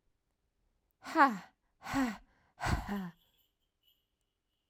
{"exhalation_length": "4.7 s", "exhalation_amplitude": 8608, "exhalation_signal_mean_std_ratio": 0.32, "survey_phase": "alpha (2021-03-01 to 2021-08-12)", "age": "45-64", "gender": "Female", "wearing_mask": "No", "symptom_none": true, "smoker_status": "Never smoked", "respiratory_condition_asthma": false, "respiratory_condition_other": false, "recruitment_source": "REACT", "submission_delay": "2 days", "covid_test_result": "Negative", "covid_test_method": "RT-qPCR"}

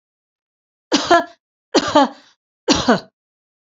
{"three_cough_length": "3.7 s", "three_cough_amplitude": 29475, "three_cough_signal_mean_std_ratio": 0.37, "survey_phase": "beta (2021-08-13 to 2022-03-07)", "age": "45-64", "gender": "Female", "wearing_mask": "No", "symptom_none": true, "smoker_status": "Never smoked", "respiratory_condition_asthma": false, "respiratory_condition_other": false, "recruitment_source": "REACT", "submission_delay": "1 day", "covid_test_result": "Negative", "covid_test_method": "RT-qPCR"}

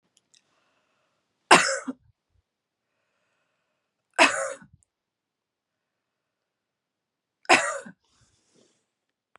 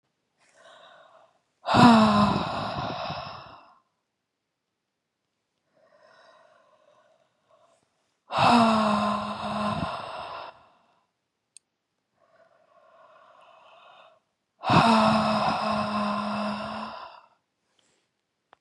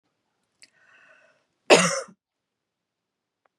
{"three_cough_length": "9.4 s", "three_cough_amplitude": 32719, "three_cough_signal_mean_std_ratio": 0.2, "exhalation_length": "18.6 s", "exhalation_amplitude": 21410, "exhalation_signal_mean_std_ratio": 0.41, "cough_length": "3.6 s", "cough_amplitude": 29329, "cough_signal_mean_std_ratio": 0.2, "survey_phase": "beta (2021-08-13 to 2022-03-07)", "age": "18-44", "gender": "Female", "wearing_mask": "No", "symptom_sore_throat": true, "symptom_fatigue": true, "smoker_status": "Never smoked", "respiratory_condition_asthma": false, "respiratory_condition_other": false, "recruitment_source": "Test and Trace", "submission_delay": "0 days", "covid_test_result": "Negative", "covid_test_method": "LFT"}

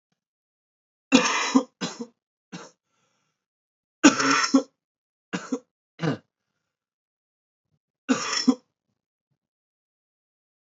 {"three_cough_length": "10.7 s", "three_cough_amplitude": 30121, "three_cough_signal_mean_std_ratio": 0.28, "survey_phase": "beta (2021-08-13 to 2022-03-07)", "age": "18-44", "gender": "Male", "wearing_mask": "No", "symptom_cough_any": true, "symptom_runny_or_blocked_nose": true, "symptom_sore_throat": true, "symptom_fatigue": true, "symptom_fever_high_temperature": true, "symptom_change_to_sense_of_smell_or_taste": true, "symptom_onset": "3 days", "smoker_status": "Ex-smoker", "respiratory_condition_asthma": false, "respiratory_condition_other": false, "recruitment_source": "Test and Trace", "submission_delay": "1 day", "covid_test_result": "Positive", "covid_test_method": "ePCR"}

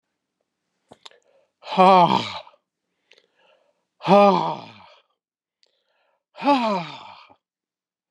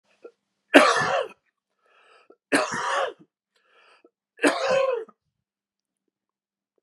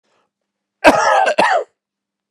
{"exhalation_length": "8.1 s", "exhalation_amplitude": 26125, "exhalation_signal_mean_std_ratio": 0.31, "three_cough_length": "6.8 s", "three_cough_amplitude": 32715, "three_cough_signal_mean_std_ratio": 0.35, "cough_length": "2.3 s", "cough_amplitude": 32768, "cough_signal_mean_std_ratio": 0.46, "survey_phase": "beta (2021-08-13 to 2022-03-07)", "age": "45-64", "gender": "Male", "wearing_mask": "No", "symptom_runny_or_blocked_nose": true, "symptom_onset": "3 days", "smoker_status": "Never smoked", "respiratory_condition_asthma": false, "respiratory_condition_other": false, "recruitment_source": "Test and Trace", "submission_delay": "2 days", "covid_test_result": "Positive", "covid_test_method": "RT-qPCR", "covid_ct_value": 25.8, "covid_ct_gene": "ORF1ab gene"}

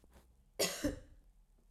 {"cough_length": "1.7 s", "cough_amplitude": 3023, "cough_signal_mean_std_ratio": 0.39, "survey_phase": "alpha (2021-03-01 to 2021-08-12)", "age": "18-44", "gender": "Female", "wearing_mask": "No", "symptom_prefer_not_to_say": true, "symptom_onset": "3 days", "smoker_status": "Never smoked", "respiratory_condition_asthma": false, "respiratory_condition_other": false, "recruitment_source": "Test and Trace", "submission_delay": "2 days", "covid_test_result": "Positive", "covid_test_method": "RT-qPCR", "covid_ct_value": 20.3, "covid_ct_gene": "ORF1ab gene", "covid_ct_mean": 21.1, "covid_viral_load": "120000 copies/ml", "covid_viral_load_category": "Low viral load (10K-1M copies/ml)"}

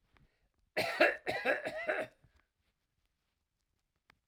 {"cough_length": "4.3 s", "cough_amplitude": 7130, "cough_signal_mean_std_ratio": 0.36, "survey_phase": "alpha (2021-03-01 to 2021-08-12)", "age": "65+", "gender": "Male", "wearing_mask": "No", "symptom_none": true, "smoker_status": "Never smoked", "respiratory_condition_asthma": false, "respiratory_condition_other": false, "recruitment_source": "REACT", "submission_delay": "3 days", "covid_test_result": "Negative", "covid_test_method": "RT-qPCR"}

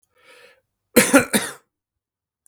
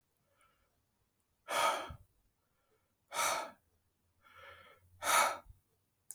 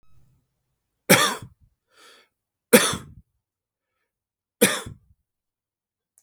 {"cough_length": "2.5 s", "cough_amplitude": 32768, "cough_signal_mean_std_ratio": 0.29, "exhalation_length": "6.1 s", "exhalation_amplitude": 4732, "exhalation_signal_mean_std_ratio": 0.34, "three_cough_length": "6.2 s", "three_cough_amplitude": 32768, "three_cough_signal_mean_std_ratio": 0.23, "survey_phase": "beta (2021-08-13 to 2022-03-07)", "age": "18-44", "gender": "Male", "wearing_mask": "No", "symptom_none": true, "smoker_status": "Current smoker (11 or more cigarettes per day)", "respiratory_condition_asthma": false, "respiratory_condition_other": true, "recruitment_source": "REACT", "submission_delay": "3 days", "covid_test_result": "Negative", "covid_test_method": "RT-qPCR", "influenza_a_test_result": "Negative", "influenza_b_test_result": "Negative"}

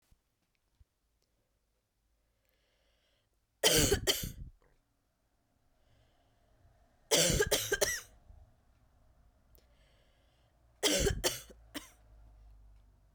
{"three_cough_length": "13.1 s", "three_cough_amplitude": 8268, "three_cough_signal_mean_std_ratio": 0.31, "survey_phase": "beta (2021-08-13 to 2022-03-07)", "age": "18-44", "gender": "Female", "wearing_mask": "No", "symptom_cough_any": true, "symptom_runny_or_blocked_nose": true, "symptom_shortness_of_breath": true, "symptom_sore_throat": true, "symptom_fatigue": true, "symptom_fever_high_temperature": true, "symptom_headache": true, "symptom_change_to_sense_of_smell_or_taste": true, "symptom_other": true, "symptom_onset": "4 days", "smoker_status": "Never smoked", "respiratory_condition_asthma": false, "respiratory_condition_other": false, "recruitment_source": "Test and Trace", "submission_delay": "2 days", "covid_test_result": "Positive", "covid_test_method": "RT-qPCR"}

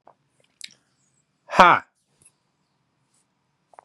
{"exhalation_length": "3.8 s", "exhalation_amplitude": 32768, "exhalation_signal_mean_std_ratio": 0.17, "survey_phase": "beta (2021-08-13 to 2022-03-07)", "age": "18-44", "gender": "Male", "wearing_mask": "No", "symptom_cough_any": true, "symptom_runny_or_blocked_nose": true, "symptom_sore_throat": true, "smoker_status": "Current smoker (e-cigarettes or vapes only)", "respiratory_condition_asthma": false, "respiratory_condition_other": false, "recruitment_source": "Test and Trace", "submission_delay": "0 days", "covid_test_result": "Positive", "covid_test_method": "LFT"}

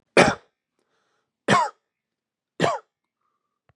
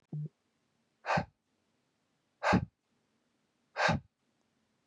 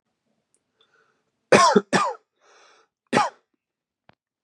{"three_cough_length": "3.8 s", "three_cough_amplitude": 32663, "three_cough_signal_mean_std_ratio": 0.28, "exhalation_length": "4.9 s", "exhalation_amplitude": 5957, "exhalation_signal_mean_std_ratio": 0.3, "cough_length": "4.4 s", "cough_amplitude": 32767, "cough_signal_mean_std_ratio": 0.28, "survey_phase": "beta (2021-08-13 to 2022-03-07)", "age": "18-44", "gender": "Male", "wearing_mask": "No", "symptom_shortness_of_breath": true, "symptom_sore_throat": true, "symptom_fatigue": true, "symptom_headache": true, "symptom_other": true, "symptom_onset": "4 days", "smoker_status": "Never smoked", "respiratory_condition_asthma": false, "respiratory_condition_other": false, "recruitment_source": "Test and Trace", "submission_delay": "1 day", "covid_test_result": "Positive", "covid_test_method": "RT-qPCR", "covid_ct_value": 29.4, "covid_ct_gene": "ORF1ab gene", "covid_ct_mean": 31.7, "covid_viral_load": "41 copies/ml", "covid_viral_load_category": "Minimal viral load (< 10K copies/ml)"}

